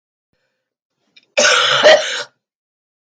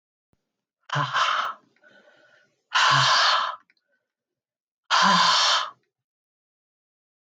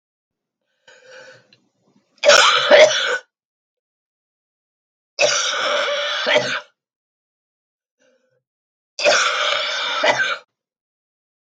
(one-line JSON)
{"cough_length": "3.2 s", "cough_amplitude": 32331, "cough_signal_mean_std_ratio": 0.4, "exhalation_length": "7.3 s", "exhalation_amplitude": 15359, "exhalation_signal_mean_std_ratio": 0.46, "three_cough_length": "11.4 s", "three_cough_amplitude": 32768, "three_cough_signal_mean_std_ratio": 0.43, "survey_phase": "beta (2021-08-13 to 2022-03-07)", "age": "45-64", "gender": "Female", "wearing_mask": "No", "symptom_cough_any": true, "symptom_new_continuous_cough": true, "symptom_sore_throat": true, "symptom_headache": true, "symptom_onset": "5 days", "smoker_status": "Never smoked", "respiratory_condition_asthma": false, "respiratory_condition_other": true, "recruitment_source": "Test and Trace", "submission_delay": "4 days", "covid_test_result": "Negative", "covid_test_method": "RT-qPCR"}